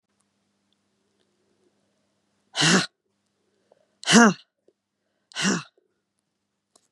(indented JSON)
{
  "exhalation_length": "6.9 s",
  "exhalation_amplitude": 28138,
  "exhalation_signal_mean_std_ratio": 0.24,
  "survey_phase": "beta (2021-08-13 to 2022-03-07)",
  "age": "45-64",
  "gender": "Female",
  "wearing_mask": "No",
  "symptom_none": true,
  "symptom_onset": "12 days",
  "smoker_status": "Never smoked",
  "respiratory_condition_asthma": false,
  "respiratory_condition_other": false,
  "recruitment_source": "REACT",
  "submission_delay": "1 day",
  "covid_test_result": "Negative",
  "covid_test_method": "RT-qPCR",
  "influenza_a_test_result": "Unknown/Void",
  "influenza_b_test_result": "Unknown/Void"
}